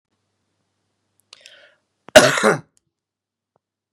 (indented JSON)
{
  "cough_length": "3.9 s",
  "cough_amplitude": 32768,
  "cough_signal_mean_std_ratio": 0.21,
  "survey_phase": "beta (2021-08-13 to 2022-03-07)",
  "age": "45-64",
  "gender": "Male",
  "wearing_mask": "No",
  "symptom_cough_any": true,
  "symptom_new_continuous_cough": true,
  "symptom_runny_or_blocked_nose": true,
  "symptom_sore_throat": true,
  "symptom_fatigue": true,
  "symptom_onset": "2 days",
  "smoker_status": "Never smoked",
  "respiratory_condition_asthma": false,
  "respiratory_condition_other": false,
  "recruitment_source": "Test and Trace",
  "submission_delay": "2 days",
  "covid_test_result": "Positive",
  "covid_test_method": "RT-qPCR",
  "covid_ct_value": 23.0,
  "covid_ct_gene": "N gene"
}